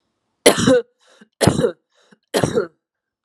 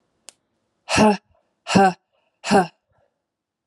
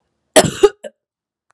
three_cough_length: 3.2 s
three_cough_amplitude: 32768
three_cough_signal_mean_std_ratio: 0.39
exhalation_length: 3.7 s
exhalation_amplitude: 26182
exhalation_signal_mean_std_ratio: 0.34
cough_length: 1.5 s
cough_amplitude: 32768
cough_signal_mean_std_ratio: 0.28
survey_phase: alpha (2021-03-01 to 2021-08-12)
age: 18-44
gender: Female
wearing_mask: 'No'
symptom_cough_any: true
symptom_shortness_of_breath: true
symptom_fatigue: true
symptom_headache: true
symptom_change_to_sense_of_smell_or_taste: true
symptom_onset: 3 days
smoker_status: Never smoked
respiratory_condition_asthma: false
respiratory_condition_other: false
recruitment_source: Test and Trace
submission_delay: 2 days
covid_test_result: Positive
covid_test_method: RT-qPCR
covid_ct_value: 15.1
covid_ct_gene: S gene
covid_ct_mean: 15.3
covid_viral_load: 9700000 copies/ml
covid_viral_load_category: High viral load (>1M copies/ml)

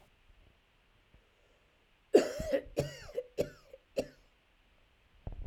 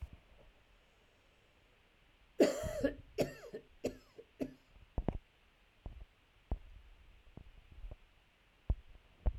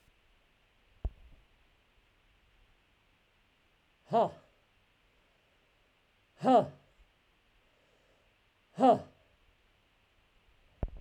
cough_length: 5.5 s
cough_amplitude: 9447
cough_signal_mean_std_ratio: 0.28
three_cough_length: 9.4 s
three_cough_amplitude: 5779
three_cough_signal_mean_std_ratio: 0.31
exhalation_length: 11.0 s
exhalation_amplitude: 7429
exhalation_signal_mean_std_ratio: 0.21
survey_phase: beta (2021-08-13 to 2022-03-07)
age: 65+
gender: Male
wearing_mask: 'No'
symptom_runny_or_blocked_nose: true
symptom_fatigue: true
symptom_change_to_sense_of_smell_or_taste: true
symptom_onset: 3 days
smoker_status: Never smoked
respiratory_condition_asthma: false
respiratory_condition_other: false
recruitment_source: Test and Trace
submission_delay: 2 days
covid_test_result: Positive
covid_test_method: RT-qPCR
covid_ct_value: 21.8
covid_ct_gene: ORF1ab gene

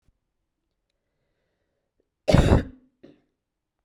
cough_length: 3.8 s
cough_amplitude: 31254
cough_signal_mean_std_ratio: 0.23
survey_phase: beta (2021-08-13 to 2022-03-07)
age: 18-44
gender: Female
wearing_mask: 'No'
symptom_runny_or_blocked_nose: true
symptom_onset: 2 days
smoker_status: Never smoked
respiratory_condition_asthma: false
respiratory_condition_other: false
recruitment_source: Test and Trace
submission_delay: 1 day
covid_test_result: Positive
covid_test_method: RT-qPCR
covid_ct_value: 17.3
covid_ct_gene: ORF1ab gene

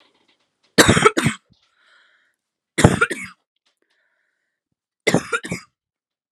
three_cough_length: 6.3 s
three_cough_amplitude: 32768
three_cough_signal_mean_std_ratio: 0.28
survey_phase: alpha (2021-03-01 to 2021-08-12)
age: 18-44
gender: Female
wearing_mask: 'No'
symptom_cough_any: true
symptom_new_continuous_cough: true
symptom_abdominal_pain: true
symptom_diarrhoea: true
symptom_fever_high_temperature: true
symptom_headache: true
symptom_change_to_sense_of_smell_or_taste: true
symptom_onset: 11 days
smoker_status: Prefer not to say
respiratory_condition_asthma: false
respiratory_condition_other: false
recruitment_source: Test and Trace
submission_delay: 3 days
covid_test_result: Positive
covid_test_method: ePCR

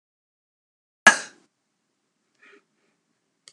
three_cough_length: 3.5 s
three_cough_amplitude: 32768
three_cough_signal_mean_std_ratio: 0.12
survey_phase: alpha (2021-03-01 to 2021-08-12)
age: 65+
gender: Female
wearing_mask: 'No'
symptom_none: true
smoker_status: Never smoked
respiratory_condition_asthma: false
respiratory_condition_other: false
recruitment_source: REACT
submission_delay: 1 day
covid_test_result: Negative
covid_test_method: RT-qPCR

